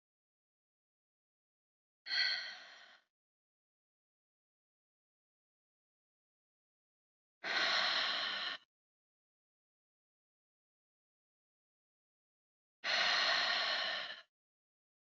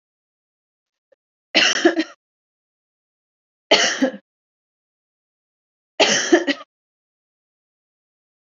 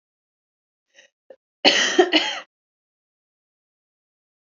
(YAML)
exhalation_length: 15.1 s
exhalation_amplitude: 2855
exhalation_signal_mean_std_ratio: 0.35
three_cough_length: 8.4 s
three_cough_amplitude: 30422
three_cough_signal_mean_std_ratio: 0.29
cough_length: 4.5 s
cough_amplitude: 32213
cough_signal_mean_std_ratio: 0.27
survey_phase: alpha (2021-03-01 to 2021-08-12)
age: 18-44
gender: Female
wearing_mask: 'No'
symptom_none: true
smoker_status: Never smoked
respiratory_condition_asthma: false
respiratory_condition_other: false
recruitment_source: REACT
submission_delay: 2 days
covid_test_result: Negative
covid_test_method: RT-qPCR